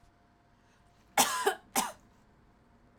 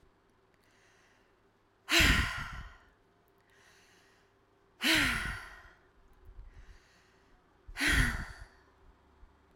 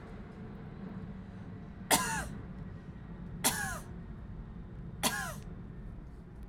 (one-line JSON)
{"cough_length": "3.0 s", "cough_amplitude": 10574, "cough_signal_mean_std_ratio": 0.32, "exhalation_length": "9.6 s", "exhalation_amplitude": 8514, "exhalation_signal_mean_std_ratio": 0.35, "three_cough_length": "6.5 s", "three_cough_amplitude": 8950, "three_cough_signal_mean_std_ratio": 0.69, "survey_phase": "alpha (2021-03-01 to 2021-08-12)", "age": "18-44", "gender": "Female", "wearing_mask": "No", "symptom_fever_high_temperature": true, "smoker_status": "Never smoked", "respiratory_condition_asthma": false, "respiratory_condition_other": false, "recruitment_source": "Test and Trace", "submission_delay": "2 days", "covid_test_result": "Positive", "covid_test_method": "RT-qPCR", "covid_ct_value": 15.8, "covid_ct_gene": "ORF1ab gene", "covid_ct_mean": 16.1, "covid_viral_load": "5100000 copies/ml", "covid_viral_load_category": "High viral load (>1M copies/ml)"}